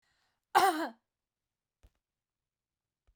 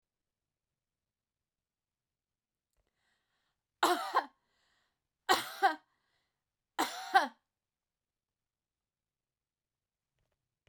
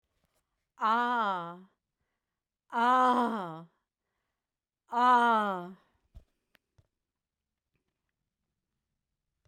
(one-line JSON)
{"cough_length": "3.2 s", "cough_amplitude": 8741, "cough_signal_mean_std_ratio": 0.24, "three_cough_length": "10.7 s", "three_cough_amplitude": 7411, "three_cough_signal_mean_std_ratio": 0.22, "exhalation_length": "9.5 s", "exhalation_amplitude": 6873, "exhalation_signal_mean_std_ratio": 0.38, "survey_phase": "beta (2021-08-13 to 2022-03-07)", "age": "65+", "gender": "Female", "wearing_mask": "No", "symptom_none": true, "smoker_status": "Never smoked", "respiratory_condition_asthma": false, "respiratory_condition_other": false, "recruitment_source": "REACT", "submission_delay": "2 days", "covid_test_result": "Negative", "covid_test_method": "RT-qPCR"}